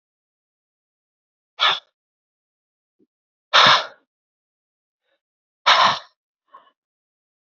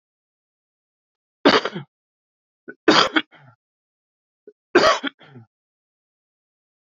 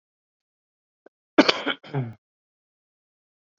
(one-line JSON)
{"exhalation_length": "7.4 s", "exhalation_amplitude": 29111, "exhalation_signal_mean_std_ratio": 0.25, "three_cough_length": "6.8 s", "three_cough_amplitude": 29378, "three_cough_signal_mean_std_ratio": 0.25, "cough_length": "3.6 s", "cough_amplitude": 27333, "cough_signal_mean_std_ratio": 0.21, "survey_phase": "beta (2021-08-13 to 2022-03-07)", "age": "18-44", "gender": "Male", "wearing_mask": "No", "symptom_none": true, "symptom_onset": "8 days", "smoker_status": "Ex-smoker", "respiratory_condition_asthma": false, "respiratory_condition_other": false, "recruitment_source": "Test and Trace", "submission_delay": "2 days", "covid_test_result": "Positive", "covid_test_method": "RT-qPCR", "covid_ct_value": 19.6, "covid_ct_gene": "ORF1ab gene", "covid_ct_mean": 20.0, "covid_viral_load": "280000 copies/ml", "covid_viral_load_category": "Low viral load (10K-1M copies/ml)"}